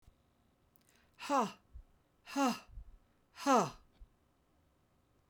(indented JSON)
{
  "exhalation_length": "5.3 s",
  "exhalation_amplitude": 3909,
  "exhalation_signal_mean_std_ratio": 0.31,
  "survey_phase": "beta (2021-08-13 to 2022-03-07)",
  "age": "65+",
  "gender": "Female",
  "wearing_mask": "No",
  "symptom_none": true,
  "smoker_status": "Never smoked",
  "respiratory_condition_asthma": false,
  "respiratory_condition_other": false,
  "recruitment_source": "REACT",
  "submission_delay": "2 days",
  "covid_test_result": "Negative",
  "covid_test_method": "RT-qPCR",
  "influenza_a_test_result": "Negative",
  "influenza_b_test_result": "Negative"
}